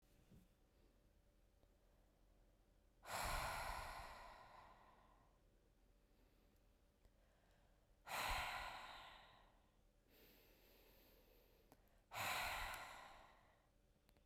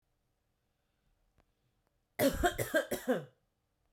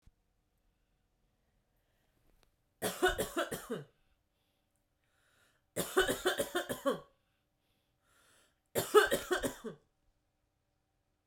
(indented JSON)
{
  "exhalation_length": "14.3 s",
  "exhalation_amplitude": 770,
  "exhalation_signal_mean_std_ratio": 0.46,
  "cough_length": "3.9 s",
  "cough_amplitude": 5084,
  "cough_signal_mean_std_ratio": 0.34,
  "three_cough_length": "11.3 s",
  "three_cough_amplitude": 9064,
  "three_cough_signal_mean_std_ratio": 0.31,
  "survey_phase": "beta (2021-08-13 to 2022-03-07)",
  "age": "18-44",
  "gender": "Female",
  "wearing_mask": "No",
  "symptom_diarrhoea": true,
  "smoker_status": "Ex-smoker",
  "respiratory_condition_asthma": false,
  "respiratory_condition_other": false,
  "recruitment_source": "Test and Trace",
  "submission_delay": "3 days",
  "covid_test_method": "RT-qPCR"
}